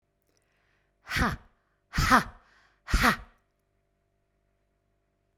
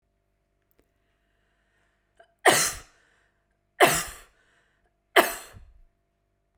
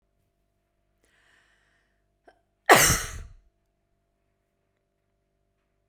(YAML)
exhalation_length: 5.4 s
exhalation_amplitude: 16519
exhalation_signal_mean_std_ratio: 0.29
three_cough_length: 6.6 s
three_cough_amplitude: 30578
three_cough_signal_mean_std_ratio: 0.24
cough_length: 5.9 s
cough_amplitude: 32767
cough_signal_mean_std_ratio: 0.18
survey_phase: beta (2021-08-13 to 2022-03-07)
age: 45-64
gender: Female
wearing_mask: 'No'
symptom_none: true
smoker_status: Never smoked
respiratory_condition_asthma: false
respiratory_condition_other: false
recruitment_source: Test and Trace
submission_delay: 0 days
covid_test_result: Negative
covid_test_method: LFT